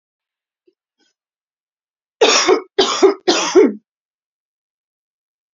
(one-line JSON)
{"three_cough_length": "5.5 s", "three_cough_amplitude": 32767, "three_cough_signal_mean_std_ratio": 0.35, "survey_phase": "beta (2021-08-13 to 2022-03-07)", "age": "18-44", "gender": "Female", "wearing_mask": "No", "symptom_cough_any": true, "symptom_runny_or_blocked_nose": true, "symptom_fatigue": true, "symptom_headache": true, "symptom_change_to_sense_of_smell_or_taste": true, "symptom_loss_of_taste": true, "symptom_onset": "5 days", "smoker_status": "Ex-smoker", "respiratory_condition_asthma": false, "respiratory_condition_other": false, "recruitment_source": "Test and Trace", "submission_delay": "1 day", "covid_test_result": "Positive", "covid_test_method": "RT-qPCR"}